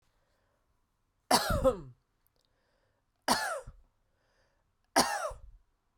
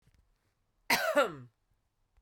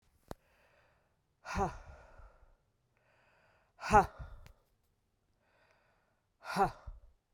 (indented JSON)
{
  "three_cough_length": "6.0 s",
  "three_cough_amplitude": 10871,
  "three_cough_signal_mean_std_ratio": 0.32,
  "cough_length": "2.2 s",
  "cough_amplitude": 7237,
  "cough_signal_mean_std_ratio": 0.34,
  "exhalation_length": "7.3 s",
  "exhalation_amplitude": 9699,
  "exhalation_signal_mean_std_ratio": 0.24,
  "survey_phase": "beta (2021-08-13 to 2022-03-07)",
  "age": "45-64",
  "gender": "Female",
  "wearing_mask": "No",
  "symptom_cough_any": true,
  "symptom_runny_or_blocked_nose": true,
  "symptom_sore_throat": true,
  "symptom_abdominal_pain": true,
  "symptom_fatigue": true,
  "symptom_fever_high_temperature": true,
  "symptom_onset": "3 days",
  "smoker_status": "Never smoked",
  "respiratory_condition_asthma": false,
  "respiratory_condition_other": false,
  "recruitment_source": "Test and Trace",
  "submission_delay": "2 days",
  "covid_test_result": "Positive",
  "covid_test_method": "RT-qPCR",
  "covid_ct_value": 16.7,
  "covid_ct_gene": "ORF1ab gene",
  "covid_ct_mean": 17.3,
  "covid_viral_load": "2100000 copies/ml",
  "covid_viral_load_category": "High viral load (>1M copies/ml)"
}